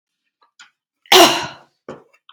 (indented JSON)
{
  "cough_length": "2.3 s",
  "cough_amplitude": 32768,
  "cough_signal_mean_std_ratio": 0.29,
  "survey_phase": "beta (2021-08-13 to 2022-03-07)",
  "age": "18-44",
  "gender": "Female",
  "wearing_mask": "No",
  "symptom_none": true,
  "smoker_status": "Never smoked",
  "respiratory_condition_asthma": false,
  "respiratory_condition_other": false,
  "recruitment_source": "REACT",
  "submission_delay": "2 days",
  "covid_test_result": "Negative",
  "covid_test_method": "RT-qPCR",
  "influenza_a_test_result": "Negative",
  "influenza_b_test_result": "Negative"
}